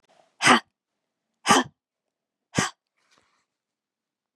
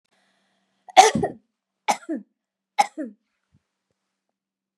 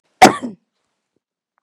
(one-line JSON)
{"exhalation_length": "4.4 s", "exhalation_amplitude": 23987, "exhalation_signal_mean_std_ratio": 0.24, "three_cough_length": "4.8 s", "three_cough_amplitude": 32767, "three_cough_signal_mean_std_ratio": 0.22, "cough_length": "1.6 s", "cough_amplitude": 32768, "cough_signal_mean_std_ratio": 0.22, "survey_phase": "beta (2021-08-13 to 2022-03-07)", "age": "45-64", "gender": "Female", "wearing_mask": "No", "symptom_none": true, "smoker_status": "Never smoked", "respiratory_condition_asthma": false, "respiratory_condition_other": false, "recruitment_source": "REACT", "submission_delay": "1 day", "covid_test_result": "Negative", "covid_test_method": "RT-qPCR"}